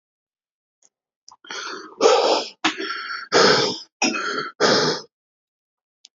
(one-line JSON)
{"exhalation_length": "6.1 s", "exhalation_amplitude": 26259, "exhalation_signal_mean_std_ratio": 0.49, "survey_phase": "alpha (2021-03-01 to 2021-08-12)", "age": "18-44", "gender": "Male", "wearing_mask": "No", "symptom_cough_any": true, "symptom_diarrhoea": true, "smoker_status": "Current smoker (e-cigarettes or vapes only)", "respiratory_condition_asthma": false, "respiratory_condition_other": false, "recruitment_source": "REACT", "submission_delay": "2 days", "covid_test_result": "Negative", "covid_test_method": "RT-qPCR"}